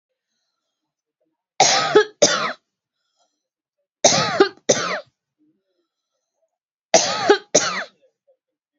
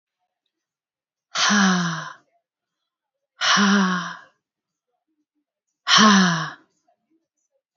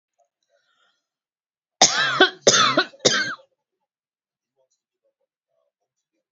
{"three_cough_length": "8.8 s", "three_cough_amplitude": 32768, "three_cough_signal_mean_std_ratio": 0.35, "exhalation_length": "7.8 s", "exhalation_amplitude": 30956, "exhalation_signal_mean_std_ratio": 0.41, "cough_length": "6.3 s", "cough_amplitude": 32767, "cough_signal_mean_std_ratio": 0.3, "survey_phase": "beta (2021-08-13 to 2022-03-07)", "age": "45-64", "gender": "Female", "wearing_mask": "No", "symptom_none": true, "smoker_status": "Never smoked", "respiratory_condition_asthma": false, "respiratory_condition_other": false, "recruitment_source": "REACT", "submission_delay": "1 day", "covid_test_result": "Negative", "covid_test_method": "RT-qPCR"}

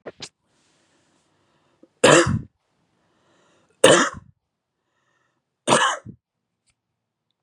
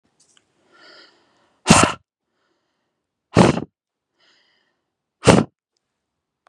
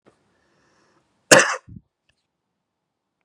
{"three_cough_length": "7.4 s", "three_cough_amplitude": 32768, "three_cough_signal_mean_std_ratio": 0.26, "exhalation_length": "6.5 s", "exhalation_amplitude": 32768, "exhalation_signal_mean_std_ratio": 0.23, "cough_length": "3.2 s", "cough_amplitude": 32768, "cough_signal_mean_std_ratio": 0.18, "survey_phase": "beta (2021-08-13 to 2022-03-07)", "age": "18-44", "gender": "Male", "wearing_mask": "No", "symptom_none": true, "smoker_status": "Ex-smoker", "respiratory_condition_asthma": false, "respiratory_condition_other": false, "recruitment_source": "REACT", "submission_delay": "4 days", "covid_test_result": "Negative", "covid_test_method": "RT-qPCR", "influenza_a_test_result": "Negative", "influenza_b_test_result": "Negative"}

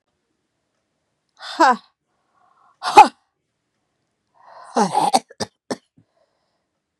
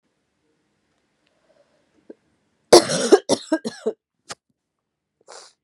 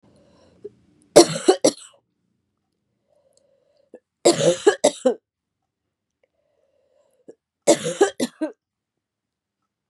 {"exhalation_length": "7.0 s", "exhalation_amplitude": 32768, "exhalation_signal_mean_std_ratio": 0.23, "cough_length": "5.6 s", "cough_amplitude": 32768, "cough_signal_mean_std_ratio": 0.22, "three_cough_length": "9.9 s", "three_cough_amplitude": 32768, "three_cough_signal_mean_std_ratio": 0.26, "survey_phase": "beta (2021-08-13 to 2022-03-07)", "age": "45-64", "gender": "Female", "wearing_mask": "No", "symptom_cough_any": true, "symptom_runny_or_blocked_nose": true, "symptom_onset": "3 days", "smoker_status": "Ex-smoker", "respiratory_condition_asthma": false, "respiratory_condition_other": false, "recruitment_source": "Test and Trace", "submission_delay": "1 day", "covid_test_result": "Positive", "covid_test_method": "RT-qPCR", "covid_ct_value": 28.0, "covid_ct_gene": "ORF1ab gene"}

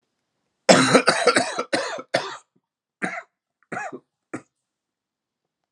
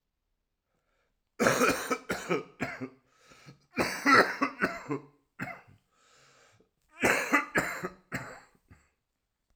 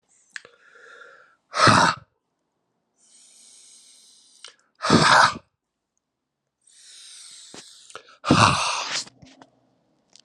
{"cough_length": "5.7 s", "cough_amplitude": 32768, "cough_signal_mean_std_ratio": 0.35, "three_cough_length": "9.6 s", "three_cough_amplitude": 13718, "three_cough_signal_mean_std_ratio": 0.39, "exhalation_length": "10.2 s", "exhalation_amplitude": 29449, "exhalation_signal_mean_std_ratio": 0.32, "survey_phase": "alpha (2021-03-01 to 2021-08-12)", "age": "45-64", "gender": "Male", "wearing_mask": "No", "symptom_cough_any": true, "symptom_fatigue": true, "symptom_headache": true, "symptom_onset": "4 days", "smoker_status": "Never smoked", "respiratory_condition_asthma": false, "respiratory_condition_other": false, "recruitment_source": "Test and Trace", "submission_delay": "2 days", "covid_test_result": "Positive", "covid_test_method": "RT-qPCR"}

